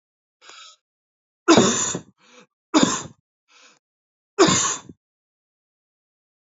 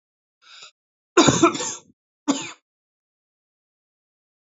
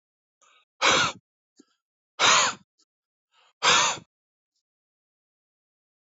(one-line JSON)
{"three_cough_length": "6.6 s", "three_cough_amplitude": 28201, "three_cough_signal_mean_std_ratio": 0.31, "cough_length": "4.4 s", "cough_amplitude": 26873, "cough_signal_mean_std_ratio": 0.27, "exhalation_length": "6.1 s", "exhalation_amplitude": 17118, "exhalation_signal_mean_std_ratio": 0.31, "survey_phase": "alpha (2021-03-01 to 2021-08-12)", "age": "45-64", "gender": "Male", "wearing_mask": "No", "symptom_cough_any": true, "symptom_shortness_of_breath": true, "symptom_fatigue": true, "symptom_headache": true, "symptom_onset": "3 days", "smoker_status": "Current smoker (1 to 10 cigarettes per day)", "respiratory_condition_asthma": false, "respiratory_condition_other": false, "recruitment_source": "Test and Trace", "submission_delay": "1 day", "covid_test_result": "Positive", "covid_test_method": "RT-qPCR", "covid_ct_value": 19.1, "covid_ct_gene": "N gene"}